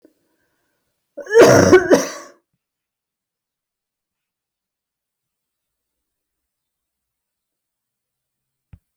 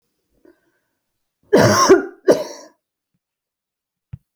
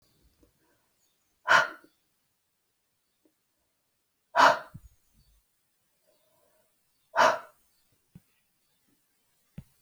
{"cough_length": "9.0 s", "cough_amplitude": 29591, "cough_signal_mean_std_ratio": 0.22, "three_cough_length": "4.4 s", "three_cough_amplitude": 28022, "three_cough_signal_mean_std_ratio": 0.31, "exhalation_length": "9.8 s", "exhalation_amplitude": 16759, "exhalation_signal_mean_std_ratio": 0.2, "survey_phase": "alpha (2021-03-01 to 2021-08-12)", "age": "45-64", "gender": "Female", "wearing_mask": "No", "symptom_none": true, "smoker_status": "Never smoked", "respiratory_condition_asthma": false, "respiratory_condition_other": false, "recruitment_source": "REACT", "submission_delay": "1 day", "covid_test_result": "Negative", "covid_test_method": "RT-qPCR"}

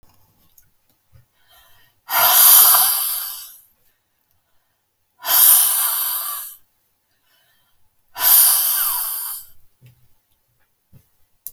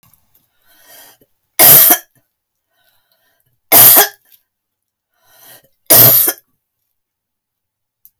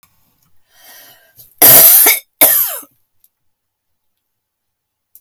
{"exhalation_length": "11.5 s", "exhalation_amplitude": 32768, "exhalation_signal_mean_std_ratio": 0.42, "three_cough_length": "8.2 s", "three_cough_amplitude": 32768, "three_cough_signal_mean_std_ratio": 0.33, "cough_length": "5.2 s", "cough_amplitude": 32768, "cough_signal_mean_std_ratio": 0.35, "survey_phase": "beta (2021-08-13 to 2022-03-07)", "age": "65+", "gender": "Female", "wearing_mask": "No", "symptom_cough_any": true, "smoker_status": "Ex-smoker", "respiratory_condition_asthma": false, "respiratory_condition_other": false, "recruitment_source": "REACT", "submission_delay": "12 days", "covid_test_result": "Negative", "covid_test_method": "RT-qPCR"}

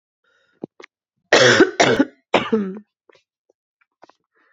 {"cough_length": "4.5 s", "cough_amplitude": 29083, "cough_signal_mean_std_ratio": 0.35, "survey_phase": "beta (2021-08-13 to 2022-03-07)", "age": "18-44", "gender": "Female", "wearing_mask": "No", "symptom_sore_throat": true, "symptom_onset": "3 days", "smoker_status": "Never smoked", "respiratory_condition_asthma": false, "respiratory_condition_other": false, "recruitment_source": "Test and Trace", "submission_delay": "1 day", "covid_test_result": "Negative", "covid_test_method": "ePCR"}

